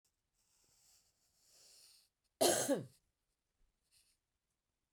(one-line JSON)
{"cough_length": "4.9 s", "cough_amplitude": 4358, "cough_signal_mean_std_ratio": 0.23, "survey_phase": "beta (2021-08-13 to 2022-03-07)", "age": "45-64", "gender": "Female", "wearing_mask": "No", "symptom_cough_any": true, "symptom_onset": "12 days", "smoker_status": "Never smoked", "respiratory_condition_asthma": false, "respiratory_condition_other": false, "recruitment_source": "REACT", "submission_delay": "1 day", "covid_test_result": "Negative", "covid_test_method": "RT-qPCR"}